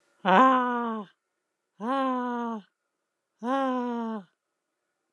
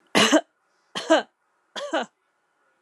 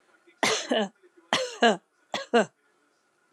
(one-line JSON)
{"exhalation_length": "5.1 s", "exhalation_amplitude": 15608, "exhalation_signal_mean_std_ratio": 0.49, "three_cough_length": "2.8 s", "three_cough_amplitude": 19266, "three_cough_signal_mean_std_ratio": 0.36, "cough_length": "3.3 s", "cough_amplitude": 16871, "cough_signal_mean_std_ratio": 0.39, "survey_phase": "alpha (2021-03-01 to 2021-08-12)", "age": "45-64", "gender": "Female", "wearing_mask": "No", "symptom_none": true, "smoker_status": "Never smoked", "respiratory_condition_asthma": false, "respiratory_condition_other": false, "recruitment_source": "REACT", "submission_delay": "6 days", "covid_test_result": "Negative", "covid_test_method": "RT-qPCR"}